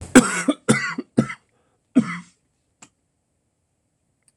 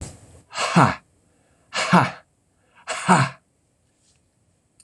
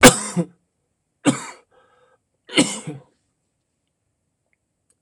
{"cough_length": "4.4 s", "cough_amplitude": 26028, "cough_signal_mean_std_ratio": 0.28, "exhalation_length": "4.8 s", "exhalation_amplitude": 26027, "exhalation_signal_mean_std_ratio": 0.35, "three_cough_length": "5.0 s", "three_cough_amplitude": 26028, "three_cough_signal_mean_std_ratio": 0.23, "survey_phase": "beta (2021-08-13 to 2022-03-07)", "age": "65+", "gender": "Female", "wearing_mask": "No", "symptom_cough_any": true, "symptom_runny_or_blocked_nose": true, "symptom_sore_throat": true, "symptom_diarrhoea": true, "symptom_onset": "5 days", "smoker_status": "Never smoked", "respiratory_condition_asthma": false, "respiratory_condition_other": false, "recruitment_source": "Test and Trace", "submission_delay": "1 day", "covid_test_result": "Negative", "covid_test_method": "RT-qPCR"}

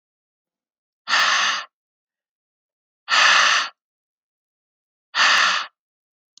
{"exhalation_length": "6.4 s", "exhalation_amplitude": 26885, "exhalation_signal_mean_std_ratio": 0.41, "survey_phase": "beta (2021-08-13 to 2022-03-07)", "age": "18-44", "gender": "Male", "wearing_mask": "No", "symptom_cough_any": true, "symptom_runny_or_blocked_nose": true, "symptom_sore_throat": true, "symptom_fatigue": true, "symptom_onset": "5 days", "smoker_status": "Never smoked", "respiratory_condition_asthma": false, "respiratory_condition_other": false, "recruitment_source": "Test and Trace", "submission_delay": "2 days", "covid_test_result": "Positive", "covid_test_method": "RT-qPCR", "covid_ct_value": 19.2, "covid_ct_gene": "N gene", "covid_ct_mean": 19.4, "covid_viral_load": "440000 copies/ml", "covid_viral_load_category": "Low viral load (10K-1M copies/ml)"}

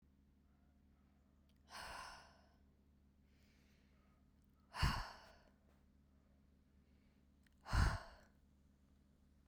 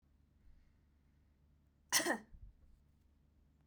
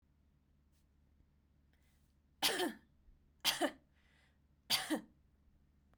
{"exhalation_length": "9.5 s", "exhalation_amplitude": 2018, "exhalation_signal_mean_std_ratio": 0.27, "cough_length": "3.7 s", "cough_amplitude": 3881, "cough_signal_mean_std_ratio": 0.26, "three_cough_length": "6.0 s", "three_cough_amplitude": 3875, "three_cough_signal_mean_std_ratio": 0.31, "survey_phase": "beta (2021-08-13 to 2022-03-07)", "age": "18-44", "gender": "Female", "wearing_mask": "No", "symptom_none": true, "smoker_status": "Never smoked", "respiratory_condition_asthma": false, "respiratory_condition_other": false, "recruitment_source": "Test and Trace", "submission_delay": "0 days", "covid_test_result": "Negative", "covid_test_method": "LFT"}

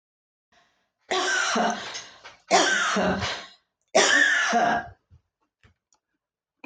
{"three_cough_length": "6.7 s", "three_cough_amplitude": 13137, "three_cough_signal_mean_std_ratio": 0.54, "survey_phase": "beta (2021-08-13 to 2022-03-07)", "age": "65+", "gender": "Female", "wearing_mask": "No", "symptom_none": true, "smoker_status": "Ex-smoker", "respiratory_condition_asthma": false, "respiratory_condition_other": false, "recruitment_source": "REACT", "submission_delay": "2 days", "covid_test_result": "Negative", "covid_test_method": "RT-qPCR"}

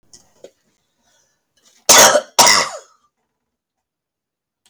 {"cough_length": "4.7 s", "cough_amplitude": 32768, "cough_signal_mean_std_ratio": 0.29, "survey_phase": "alpha (2021-03-01 to 2021-08-12)", "age": "65+", "gender": "Female", "wearing_mask": "No", "symptom_none": true, "smoker_status": "Ex-smoker", "respiratory_condition_asthma": false, "respiratory_condition_other": false, "recruitment_source": "REACT", "submission_delay": "2 days", "covid_test_result": "Negative", "covid_test_method": "RT-qPCR"}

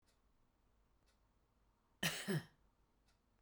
{"cough_length": "3.4 s", "cough_amplitude": 2236, "cough_signal_mean_std_ratio": 0.28, "survey_phase": "beta (2021-08-13 to 2022-03-07)", "age": "45-64", "gender": "Female", "wearing_mask": "No", "symptom_shortness_of_breath": true, "symptom_fatigue": true, "symptom_headache": true, "smoker_status": "Current smoker (e-cigarettes or vapes only)", "respiratory_condition_asthma": false, "respiratory_condition_other": false, "recruitment_source": "REACT", "submission_delay": "15 days", "covid_test_result": "Negative", "covid_test_method": "RT-qPCR"}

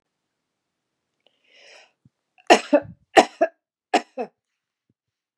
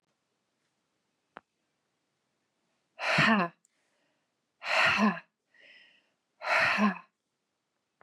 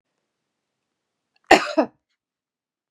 {"three_cough_length": "5.4 s", "three_cough_amplitude": 32768, "three_cough_signal_mean_std_ratio": 0.2, "exhalation_length": "8.0 s", "exhalation_amplitude": 8861, "exhalation_signal_mean_std_ratio": 0.35, "cough_length": "2.9 s", "cough_amplitude": 32767, "cough_signal_mean_std_ratio": 0.19, "survey_phase": "beta (2021-08-13 to 2022-03-07)", "age": "45-64", "gender": "Female", "wearing_mask": "No", "symptom_none": true, "smoker_status": "Ex-smoker", "respiratory_condition_asthma": true, "respiratory_condition_other": false, "recruitment_source": "REACT", "submission_delay": "2 days", "covid_test_result": "Negative", "covid_test_method": "RT-qPCR", "influenza_a_test_result": "Negative", "influenza_b_test_result": "Negative"}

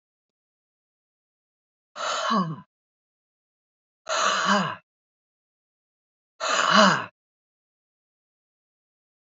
{"exhalation_length": "9.4 s", "exhalation_amplitude": 19933, "exhalation_signal_mean_std_ratio": 0.33, "survey_phase": "beta (2021-08-13 to 2022-03-07)", "age": "65+", "gender": "Female", "wearing_mask": "No", "symptom_none": true, "smoker_status": "Never smoked", "respiratory_condition_asthma": false, "respiratory_condition_other": false, "recruitment_source": "REACT", "submission_delay": "2 days", "covid_test_result": "Positive", "covid_test_method": "RT-qPCR", "covid_ct_value": 24.0, "covid_ct_gene": "E gene", "influenza_a_test_result": "Negative", "influenza_b_test_result": "Negative"}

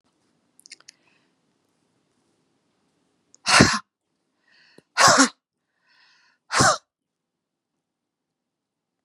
{"exhalation_length": "9.0 s", "exhalation_amplitude": 30526, "exhalation_signal_mean_std_ratio": 0.23, "survey_phase": "beta (2021-08-13 to 2022-03-07)", "age": "65+", "gender": "Female", "wearing_mask": "No", "symptom_none": true, "smoker_status": "Ex-smoker", "respiratory_condition_asthma": false, "respiratory_condition_other": false, "recruitment_source": "REACT", "submission_delay": "2 days", "covid_test_result": "Negative", "covid_test_method": "RT-qPCR", "influenza_a_test_result": "Unknown/Void", "influenza_b_test_result": "Unknown/Void"}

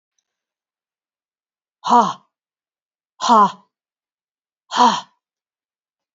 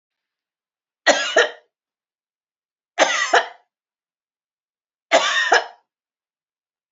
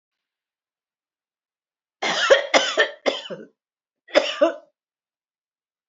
{"exhalation_length": "6.1 s", "exhalation_amplitude": 26710, "exhalation_signal_mean_std_ratio": 0.27, "three_cough_length": "6.9 s", "three_cough_amplitude": 30005, "three_cough_signal_mean_std_ratio": 0.32, "cough_length": "5.9 s", "cough_amplitude": 28731, "cough_signal_mean_std_ratio": 0.33, "survey_phase": "alpha (2021-03-01 to 2021-08-12)", "age": "45-64", "gender": "Female", "wearing_mask": "No", "symptom_none": true, "smoker_status": "Never smoked", "respiratory_condition_asthma": false, "respiratory_condition_other": false, "recruitment_source": "REACT", "submission_delay": "1 day", "covid_test_result": "Negative", "covid_test_method": "RT-qPCR"}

